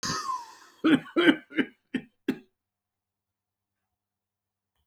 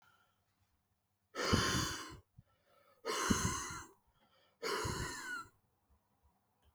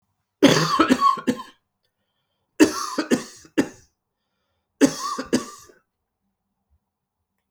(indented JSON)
{
  "cough_length": "4.9 s",
  "cough_amplitude": 18784,
  "cough_signal_mean_std_ratio": 0.31,
  "exhalation_length": "6.7 s",
  "exhalation_amplitude": 5454,
  "exhalation_signal_mean_std_ratio": 0.46,
  "three_cough_length": "7.5 s",
  "three_cough_amplitude": 32167,
  "three_cough_signal_mean_std_ratio": 0.35,
  "survey_phase": "beta (2021-08-13 to 2022-03-07)",
  "age": "65+",
  "gender": "Male",
  "wearing_mask": "No",
  "symptom_fatigue": true,
  "smoker_status": "Never smoked",
  "respiratory_condition_asthma": false,
  "respiratory_condition_other": false,
  "recruitment_source": "Test and Trace",
  "submission_delay": "-1 day",
  "covid_test_result": "Positive",
  "covid_test_method": "LFT"
}